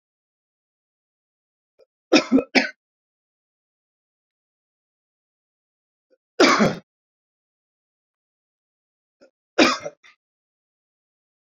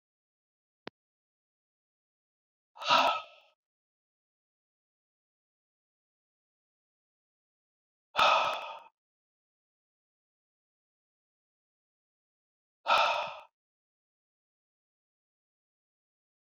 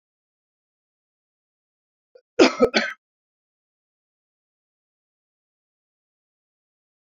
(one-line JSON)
{"three_cough_length": "11.4 s", "three_cough_amplitude": 27418, "three_cough_signal_mean_std_ratio": 0.21, "exhalation_length": "16.5 s", "exhalation_amplitude": 8995, "exhalation_signal_mean_std_ratio": 0.21, "cough_length": "7.1 s", "cough_amplitude": 27847, "cough_signal_mean_std_ratio": 0.16, "survey_phase": "beta (2021-08-13 to 2022-03-07)", "age": "65+", "gender": "Male", "wearing_mask": "No", "symptom_none": true, "smoker_status": "Ex-smoker", "respiratory_condition_asthma": false, "respiratory_condition_other": false, "recruitment_source": "REACT", "submission_delay": "1 day", "covid_test_result": "Negative", "covid_test_method": "RT-qPCR"}